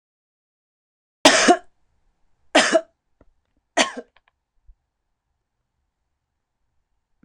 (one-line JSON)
{"cough_length": "7.2 s", "cough_amplitude": 26028, "cough_signal_mean_std_ratio": 0.23, "survey_phase": "beta (2021-08-13 to 2022-03-07)", "age": "65+", "gender": "Female", "wearing_mask": "No", "symptom_cough_any": true, "symptom_runny_or_blocked_nose": true, "symptom_onset": "7 days", "smoker_status": "Ex-smoker", "respiratory_condition_asthma": false, "respiratory_condition_other": false, "recruitment_source": "REACT", "submission_delay": "2 days", "covid_test_result": "Negative", "covid_test_method": "RT-qPCR"}